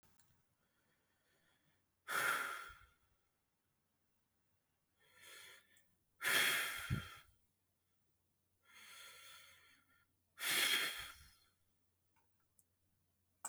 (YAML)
exhalation_length: 13.5 s
exhalation_amplitude: 2467
exhalation_signal_mean_std_ratio: 0.33
survey_phase: beta (2021-08-13 to 2022-03-07)
age: 18-44
gender: Male
wearing_mask: 'No'
symptom_none: true
smoker_status: Never smoked
respiratory_condition_asthma: false
respiratory_condition_other: false
recruitment_source: REACT
submission_delay: 1 day
covid_test_result: Negative
covid_test_method: RT-qPCR